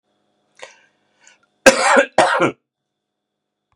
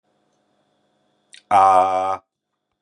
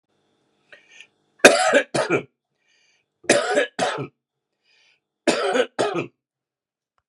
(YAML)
cough_length: 3.8 s
cough_amplitude: 32768
cough_signal_mean_std_ratio: 0.32
exhalation_length: 2.8 s
exhalation_amplitude: 28257
exhalation_signal_mean_std_ratio: 0.38
three_cough_length: 7.1 s
three_cough_amplitude: 32768
three_cough_signal_mean_std_ratio: 0.37
survey_phase: beta (2021-08-13 to 2022-03-07)
age: 45-64
gender: Male
wearing_mask: 'No'
symptom_cough_any: true
symptom_runny_or_blocked_nose: true
symptom_sore_throat: true
symptom_fatigue: true
symptom_headache: true
smoker_status: Never smoked
respiratory_condition_asthma: false
respiratory_condition_other: false
recruitment_source: Test and Trace
submission_delay: 2 days
covid_test_result: Positive
covid_test_method: LFT